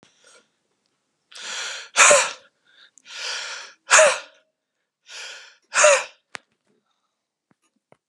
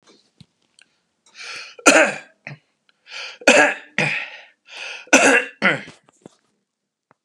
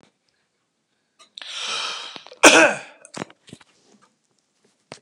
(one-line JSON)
{"exhalation_length": "8.1 s", "exhalation_amplitude": 30915, "exhalation_signal_mean_std_ratio": 0.31, "three_cough_length": "7.2 s", "three_cough_amplitude": 32768, "three_cough_signal_mean_std_ratio": 0.34, "cough_length": "5.0 s", "cough_amplitude": 32768, "cough_signal_mean_std_ratio": 0.25, "survey_phase": "beta (2021-08-13 to 2022-03-07)", "age": "18-44", "gender": "Male", "wearing_mask": "No", "symptom_none": true, "smoker_status": "Never smoked", "respiratory_condition_asthma": false, "respiratory_condition_other": false, "recruitment_source": "REACT", "submission_delay": "4 days", "covid_test_result": "Negative", "covid_test_method": "RT-qPCR"}